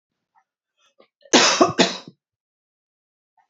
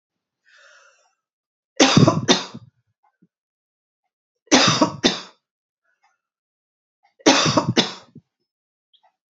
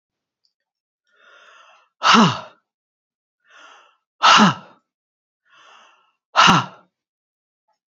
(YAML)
cough_length: 3.5 s
cough_amplitude: 29845
cough_signal_mean_std_ratio: 0.29
three_cough_length: 9.3 s
three_cough_amplitude: 32768
three_cough_signal_mean_std_ratio: 0.31
exhalation_length: 7.9 s
exhalation_amplitude: 29919
exhalation_signal_mean_std_ratio: 0.28
survey_phase: beta (2021-08-13 to 2022-03-07)
age: 45-64
gender: Female
wearing_mask: 'No'
symptom_none: true
smoker_status: Ex-smoker
respiratory_condition_asthma: false
respiratory_condition_other: false
recruitment_source: REACT
submission_delay: 1 day
covid_test_result: Negative
covid_test_method: RT-qPCR